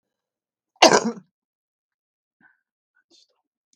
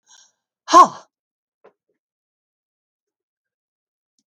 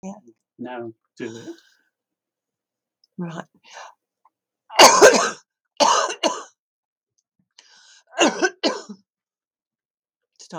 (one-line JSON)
{"cough_length": "3.8 s", "cough_amplitude": 32768, "cough_signal_mean_std_ratio": 0.18, "exhalation_length": "4.3 s", "exhalation_amplitude": 32768, "exhalation_signal_mean_std_ratio": 0.15, "three_cough_length": "10.6 s", "three_cough_amplitude": 32768, "three_cough_signal_mean_std_ratio": 0.28, "survey_phase": "beta (2021-08-13 to 2022-03-07)", "age": "65+", "gender": "Female", "wearing_mask": "No", "symptom_none": true, "symptom_onset": "12 days", "smoker_status": "Never smoked", "respiratory_condition_asthma": false, "respiratory_condition_other": false, "recruitment_source": "REACT", "submission_delay": "3 days", "covid_test_result": "Negative", "covid_test_method": "RT-qPCR", "influenza_a_test_result": "Unknown/Void", "influenza_b_test_result": "Unknown/Void"}